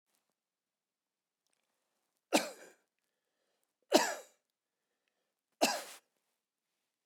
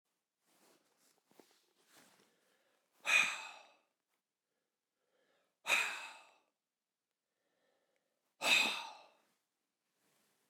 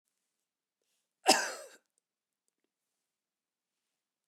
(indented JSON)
{
  "three_cough_length": "7.1 s",
  "three_cough_amplitude": 10679,
  "three_cough_signal_mean_std_ratio": 0.2,
  "exhalation_length": "10.5 s",
  "exhalation_amplitude": 4578,
  "exhalation_signal_mean_std_ratio": 0.25,
  "cough_length": "4.3 s",
  "cough_amplitude": 11835,
  "cough_signal_mean_std_ratio": 0.16,
  "survey_phase": "beta (2021-08-13 to 2022-03-07)",
  "age": "65+",
  "gender": "Male",
  "wearing_mask": "No",
  "symptom_none": true,
  "smoker_status": "Ex-smoker",
  "respiratory_condition_asthma": false,
  "respiratory_condition_other": false,
  "recruitment_source": "REACT",
  "submission_delay": "1 day",
  "covid_test_result": "Negative",
  "covid_test_method": "RT-qPCR"
}